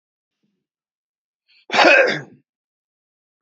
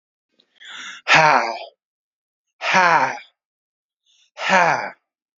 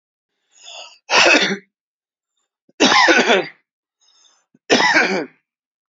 {
  "cough_length": "3.4 s",
  "cough_amplitude": 28552,
  "cough_signal_mean_std_ratio": 0.28,
  "exhalation_length": "5.4 s",
  "exhalation_amplitude": 28586,
  "exhalation_signal_mean_std_ratio": 0.4,
  "three_cough_length": "5.9 s",
  "three_cough_amplitude": 32768,
  "three_cough_signal_mean_std_ratio": 0.44,
  "survey_phase": "beta (2021-08-13 to 2022-03-07)",
  "age": "45-64",
  "gender": "Male",
  "wearing_mask": "No",
  "symptom_none": true,
  "smoker_status": "Never smoked",
  "respiratory_condition_asthma": false,
  "respiratory_condition_other": false,
  "recruitment_source": "REACT",
  "submission_delay": "10 days",
  "covid_test_result": "Negative",
  "covid_test_method": "RT-qPCR",
  "influenza_a_test_result": "Negative",
  "influenza_b_test_result": "Negative"
}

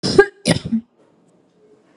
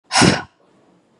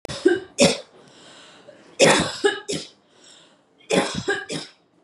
{
  "cough_length": "2.0 s",
  "cough_amplitude": 32768,
  "cough_signal_mean_std_ratio": 0.34,
  "exhalation_length": "1.2 s",
  "exhalation_amplitude": 32445,
  "exhalation_signal_mean_std_ratio": 0.38,
  "three_cough_length": "5.0 s",
  "three_cough_amplitude": 27899,
  "three_cough_signal_mean_std_ratio": 0.43,
  "survey_phase": "beta (2021-08-13 to 2022-03-07)",
  "age": "18-44",
  "gender": "Female",
  "wearing_mask": "No",
  "symptom_none": true,
  "smoker_status": "Never smoked",
  "respiratory_condition_asthma": false,
  "respiratory_condition_other": false,
  "recruitment_source": "REACT",
  "submission_delay": "1 day",
  "covid_test_result": "Negative",
  "covid_test_method": "RT-qPCR",
  "influenza_a_test_result": "Negative",
  "influenza_b_test_result": "Negative"
}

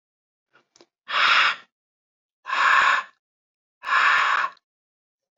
{
  "exhalation_length": "5.4 s",
  "exhalation_amplitude": 19935,
  "exhalation_signal_mean_std_ratio": 0.46,
  "survey_phase": "alpha (2021-03-01 to 2021-08-12)",
  "age": "18-44",
  "gender": "Male",
  "wearing_mask": "No",
  "symptom_new_continuous_cough": true,
  "symptom_fatigue": true,
  "symptom_fever_high_temperature": true,
  "smoker_status": "Never smoked",
  "respiratory_condition_asthma": false,
  "respiratory_condition_other": false,
  "recruitment_source": "Test and Trace",
  "submission_delay": "2 days",
  "covid_test_result": "Positive",
  "covid_test_method": "RT-qPCR",
  "covid_ct_value": 10.7,
  "covid_ct_gene": "ORF1ab gene",
  "covid_ct_mean": 11.0,
  "covid_viral_load": "250000000 copies/ml",
  "covid_viral_load_category": "High viral load (>1M copies/ml)"
}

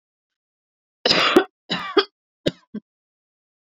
{
  "three_cough_length": "3.7 s",
  "three_cough_amplitude": 28456,
  "three_cough_signal_mean_std_ratio": 0.31,
  "survey_phase": "beta (2021-08-13 to 2022-03-07)",
  "age": "18-44",
  "gender": "Female",
  "wearing_mask": "No",
  "symptom_none": true,
  "smoker_status": "Never smoked",
  "respiratory_condition_asthma": false,
  "respiratory_condition_other": false,
  "recruitment_source": "REACT",
  "submission_delay": "8 days",
  "covid_test_result": "Negative",
  "covid_test_method": "RT-qPCR"
}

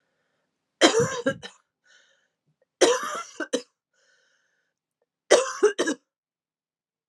{
  "three_cough_length": "7.1 s",
  "three_cough_amplitude": 27726,
  "three_cough_signal_mean_std_ratio": 0.32,
  "survey_phase": "alpha (2021-03-01 to 2021-08-12)",
  "age": "18-44",
  "gender": "Female",
  "wearing_mask": "No",
  "symptom_new_continuous_cough": true,
  "symptom_fatigue": true,
  "symptom_headache": true,
  "symptom_onset": "4 days",
  "smoker_status": "Ex-smoker",
  "respiratory_condition_asthma": false,
  "respiratory_condition_other": false,
  "recruitment_source": "Test and Trace",
  "submission_delay": "2 days",
  "covid_test_result": "Positive",
  "covid_test_method": "RT-qPCR",
  "covid_ct_value": 22.8,
  "covid_ct_gene": "ORF1ab gene",
  "covid_ct_mean": 23.0,
  "covid_viral_load": "29000 copies/ml",
  "covid_viral_load_category": "Low viral load (10K-1M copies/ml)"
}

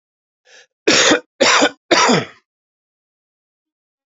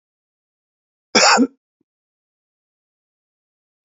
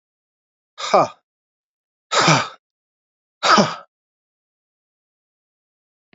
{
  "three_cough_length": "4.1 s",
  "three_cough_amplitude": 32767,
  "three_cough_signal_mean_std_ratio": 0.4,
  "cough_length": "3.8 s",
  "cough_amplitude": 31820,
  "cough_signal_mean_std_ratio": 0.23,
  "exhalation_length": "6.1 s",
  "exhalation_amplitude": 32767,
  "exhalation_signal_mean_std_ratio": 0.28,
  "survey_phase": "alpha (2021-03-01 to 2021-08-12)",
  "age": "18-44",
  "gender": "Male",
  "wearing_mask": "No",
  "symptom_cough_any": true,
  "symptom_new_continuous_cough": true,
  "symptom_fatigue": true,
  "symptom_fever_high_temperature": true,
  "symptom_headache": true,
  "symptom_change_to_sense_of_smell_or_taste": true,
  "symptom_loss_of_taste": true,
  "smoker_status": "Ex-smoker",
  "respiratory_condition_asthma": false,
  "respiratory_condition_other": false,
  "recruitment_source": "Test and Trace",
  "submission_delay": "2 days",
  "covid_test_result": "Positive",
  "covid_test_method": "LFT"
}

